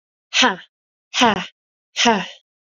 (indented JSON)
{
  "exhalation_length": "2.7 s",
  "exhalation_amplitude": 29789,
  "exhalation_signal_mean_std_ratio": 0.4,
  "survey_phase": "alpha (2021-03-01 to 2021-08-12)",
  "age": "18-44",
  "gender": "Female",
  "wearing_mask": "No",
  "symptom_none": true,
  "smoker_status": "Never smoked",
  "respiratory_condition_asthma": false,
  "respiratory_condition_other": false,
  "recruitment_source": "Test and Trace",
  "submission_delay": "2 days",
  "covid_test_result": "Positive",
  "covid_test_method": "RT-qPCR",
  "covid_ct_value": 17.8,
  "covid_ct_gene": "ORF1ab gene",
  "covid_ct_mean": 18.3,
  "covid_viral_load": "1000000 copies/ml",
  "covid_viral_load_category": "High viral load (>1M copies/ml)"
}